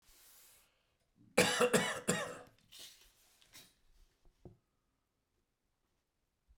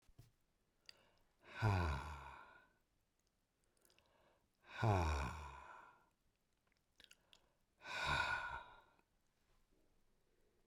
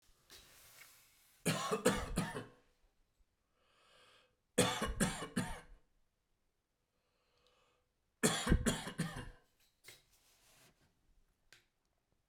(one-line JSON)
{"cough_length": "6.6 s", "cough_amplitude": 7256, "cough_signal_mean_std_ratio": 0.28, "exhalation_length": "10.7 s", "exhalation_amplitude": 1727, "exhalation_signal_mean_std_ratio": 0.38, "three_cough_length": "12.3 s", "three_cough_amplitude": 6175, "three_cough_signal_mean_std_ratio": 0.35, "survey_phase": "beta (2021-08-13 to 2022-03-07)", "age": "65+", "gender": "Male", "wearing_mask": "No", "symptom_headache": true, "smoker_status": "Ex-smoker", "respiratory_condition_asthma": false, "respiratory_condition_other": false, "recruitment_source": "REACT", "submission_delay": "2 days", "covid_test_result": "Negative", "covid_test_method": "RT-qPCR"}